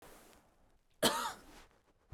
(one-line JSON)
{"cough_length": "2.1 s", "cough_amplitude": 4710, "cough_signal_mean_std_ratio": 0.33, "survey_phase": "beta (2021-08-13 to 2022-03-07)", "age": "18-44", "gender": "Female", "wearing_mask": "No", "symptom_none": true, "smoker_status": "Never smoked", "respiratory_condition_asthma": false, "respiratory_condition_other": false, "recruitment_source": "REACT", "submission_delay": "1 day", "covid_test_result": "Negative", "covid_test_method": "RT-qPCR"}